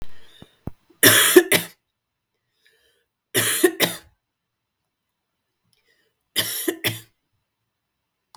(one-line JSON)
{"three_cough_length": "8.4 s", "three_cough_amplitude": 32766, "three_cough_signal_mean_std_ratio": 0.3, "survey_phase": "beta (2021-08-13 to 2022-03-07)", "age": "45-64", "gender": "Female", "wearing_mask": "No", "symptom_cough_any": true, "symptom_fatigue": true, "symptom_fever_high_temperature": true, "symptom_headache": true, "smoker_status": "Ex-smoker", "respiratory_condition_asthma": false, "respiratory_condition_other": false, "recruitment_source": "Test and Trace", "submission_delay": "2 days", "covid_test_result": "Positive", "covid_test_method": "RT-qPCR"}